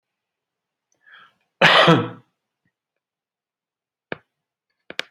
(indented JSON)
{
  "cough_length": "5.1 s",
  "cough_amplitude": 28843,
  "cough_signal_mean_std_ratio": 0.24,
  "survey_phase": "beta (2021-08-13 to 2022-03-07)",
  "age": "65+",
  "gender": "Male",
  "wearing_mask": "No",
  "symptom_none": true,
  "smoker_status": "Never smoked",
  "respiratory_condition_asthma": false,
  "respiratory_condition_other": false,
  "recruitment_source": "REACT",
  "submission_delay": "2 days",
  "covid_test_result": "Negative",
  "covid_test_method": "RT-qPCR",
  "influenza_a_test_result": "Negative",
  "influenza_b_test_result": "Negative"
}